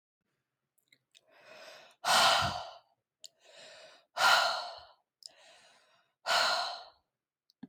{"exhalation_length": "7.7 s", "exhalation_amplitude": 8621, "exhalation_signal_mean_std_ratio": 0.37, "survey_phase": "alpha (2021-03-01 to 2021-08-12)", "age": "18-44", "gender": "Female", "wearing_mask": "No", "symptom_none": true, "smoker_status": "Never smoked", "respiratory_condition_asthma": false, "respiratory_condition_other": false, "recruitment_source": "REACT", "submission_delay": "1 day", "covid_test_result": "Negative", "covid_test_method": "RT-qPCR"}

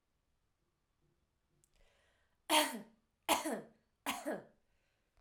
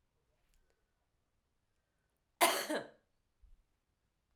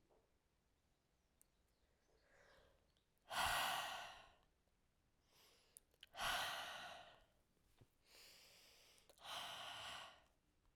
{"three_cough_length": "5.2 s", "three_cough_amplitude": 5066, "three_cough_signal_mean_std_ratio": 0.3, "cough_length": "4.4 s", "cough_amplitude": 7518, "cough_signal_mean_std_ratio": 0.22, "exhalation_length": "10.8 s", "exhalation_amplitude": 1185, "exhalation_signal_mean_std_ratio": 0.4, "survey_phase": "alpha (2021-03-01 to 2021-08-12)", "age": "18-44", "gender": "Female", "wearing_mask": "No", "symptom_cough_any": true, "symptom_abdominal_pain": true, "smoker_status": "Ex-smoker", "respiratory_condition_asthma": false, "respiratory_condition_other": false, "recruitment_source": "Test and Trace", "submission_delay": "1 day", "covid_test_result": "Positive", "covid_test_method": "RT-qPCR"}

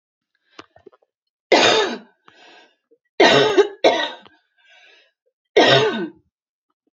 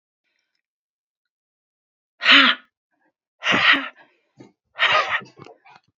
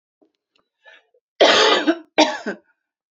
{"three_cough_length": "7.0 s", "three_cough_amplitude": 29870, "three_cough_signal_mean_std_ratio": 0.39, "exhalation_length": "6.0 s", "exhalation_amplitude": 32767, "exhalation_signal_mean_std_ratio": 0.33, "cough_length": "3.2 s", "cough_amplitude": 31405, "cough_signal_mean_std_ratio": 0.39, "survey_phase": "beta (2021-08-13 to 2022-03-07)", "age": "18-44", "gender": "Female", "wearing_mask": "No", "symptom_fatigue": true, "symptom_loss_of_taste": true, "symptom_onset": "12 days", "smoker_status": "Ex-smoker", "respiratory_condition_asthma": false, "respiratory_condition_other": true, "recruitment_source": "REACT", "submission_delay": "0 days", "covid_test_result": "Positive", "covid_test_method": "RT-qPCR", "covid_ct_value": 35.0, "covid_ct_gene": "N gene", "influenza_a_test_result": "Unknown/Void", "influenza_b_test_result": "Unknown/Void"}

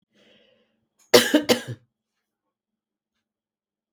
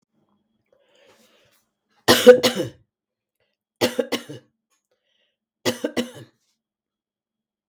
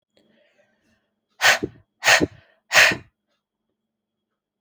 {"cough_length": "3.9 s", "cough_amplitude": 32767, "cough_signal_mean_std_ratio": 0.22, "three_cough_length": "7.7 s", "three_cough_amplitude": 32768, "three_cough_signal_mean_std_ratio": 0.22, "exhalation_length": "4.6 s", "exhalation_amplitude": 32768, "exhalation_signal_mean_std_ratio": 0.28, "survey_phase": "beta (2021-08-13 to 2022-03-07)", "age": "65+", "gender": "Female", "wearing_mask": "No", "symptom_sore_throat": true, "symptom_fatigue": true, "symptom_onset": "2 days", "smoker_status": "Ex-smoker", "respiratory_condition_asthma": false, "respiratory_condition_other": false, "recruitment_source": "Test and Trace", "submission_delay": "1 day", "covid_test_result": "Positive", "covid_test_method": "RT-qPCR"}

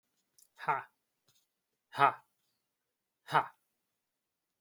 {"exhalation_length": "4.6 s", "exhalation_amplitude": 10380, "exhalation_signal_mean_std_ratio": 0.2, "survey_phase": "alpha (2021-03-01 to 2021-08-12)", "age": "18-44", "gender": "Male", "wearing_mask": "No", "symptom_none": true, "smoker_status": "Never smoked", "respiratory_condition_asthma": false, "respiratory_condition_other": false, "recruitment_source": "REACT", "submission_delay": "3 days", "covid_test_result": "Negative", "covid_test_method": "RT-qPCR"}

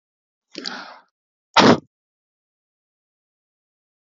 {"exhalation_length": "4.0 s", "exhalation_amplitude": 30594, "exhalation_signal_mean_std_ratio": 0.2, "survey_phase": "alpha (2021-03-01 to 2021-08-12)", "age": "45-64", "gender": "Male", "wearing_mask": "No", "symptom_none": true, "smoker_status": "Current smoker (11 or more cigarettes per day)", "respiratory_condition_asthma": false, "respiratory_condition_other": false, "recruitment_source": "REACT", "submission_delay": "2 days", "covid_test_result": "Negative", "covid_test_method": "RT-qPCR"}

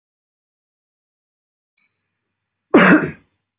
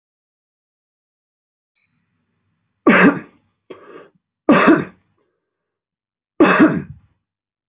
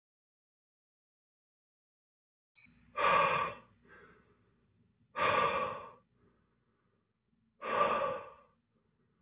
{"cough_length": "3.6 s", "cough_amplitude": 29503, "cough_signal_mean_std_ratio": 0.24, "three_cough_length": "7.7 s", "three_cough_amplitude": 32222, "three_cough_signal_mean_std_ratio": 0.3, "exhalation_length": "9.2 s", "exhalation_amplitude": 4678, "exhalation_signal_mean_std_ratio": 0.36, "survey_phase": "beta (2021-08-13 to 2022-03-07)", "age": "45-64", "gender": "Male", "wearing_mask": "No", "symptom_cough_any": true, "symptom_runny_or_blocked_nose": true, "smoker_status": "Current smoker (11 or more cigarettes per day)", "respiratory_condition_asthma": false, "respiratory_condition_other": false, "recruitment_source": "REACT", "submission_delay": "1 day", "covid_test_result": "Negative", "covid_test_method": "RT-qPCR", "influenza_a_test_result": "Negative", "influenza_b_test_result": "Negative"}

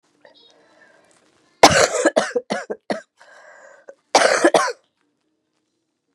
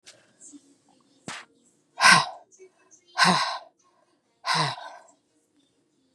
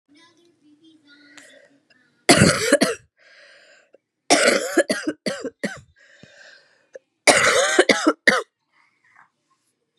{"cough_length": "6.1 s", "cough_amplitude": 32768, "cough_signal_mean_std_ratio": 0.33, "exhalation_length": "6.1 s", "exhalation_amplitude": 24823, "exhalation_signal_mean_std_ratio": 0.3, "three_cough_length": "10.0 s", "three_cough_amplitude": 32768, "three_cough_signal_mean_std_ratio": 0.37, "survey_phase": "beta (2021-08-13 to 2022-03-07)", "age": "18-44", "gender": "Female", "wearing_mask": "No", "symptom_cough_any": true, "symptom_runny_or_blocked_nose": true, "symptom_fatigue": true, "smoker_status": "Never smoked", "respiratory_condition_asthma": false, "respiratory_condition_other": false, "recruitment_source": "Test and Trace", "submission_delay": "2 days", "covid_test_result": "Positive", "covid_test_method": "RT-qPCR", "covid_ct_value": 27.1, "covid_ct_gene": "ORF1ab gene", "covid_ct_mean": 27.4, "covid_viral_load": "1000 copies/ml", "covid_viral_load_category": "Minimal viral load (< 10K copies/ml)"}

